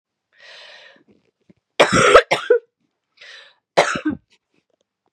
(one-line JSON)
{"three_cough_length": "5.1 s", "three_cough_amplitude": 32768, "three_cough_signal_mean_std_ratio": 0.31, "survey_phase": "beta (2021-08-13 to 2022-03-07)", "age": "18-44", "gender": "Female", "wearing_mask": "No", "symptom_cough_any": true, "symptom_new_continuous_cough": true, "symptom_runny_or_blocked_nose": true, "symptom_change_to_sense_of_smell_or_taste": true, "symptom_loss_of_taste": true, "symptom_other": true, "symptom_onset": "2 days", "smoker_status": "Never smoked", "respiratory_condition_asthma": false, "respiratory_condition_other": false, "recruitment_source": "Test and Trace", "submission_delay": "2 days", "covid_test_result": "Positive", "covid_test_method": "RT-qPCR", "covid_ct_value": 16.2, "covid_ct_gene": "ORF1ab gene", "covid_ct_mean": 16.6, "covid_viral_load": "3600000 copies/ml", "covid_viral_load_category": "High viral load (>1M copies/ml)"}